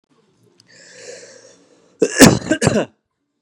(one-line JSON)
{"cough_length": "3.4 s", "cough_amplitude": 32768, "cough_signal_mean_std_ratio": 0.31, "survey_phase": "beta (2021-08-13 to 2022-03-07)", "age": "18-44", "gender": "Male", "wearing_mask": "No", "symptom_none": true, "smoker_status": "Ex-smoker", "respiratory_condition_asthma": false, "respiratory_condition_other": false, "recruitment_source": "REACT", "submission_delay": "3 days", "covid_test_result": "Negative", "covid_test_method": "RT-qPCR"}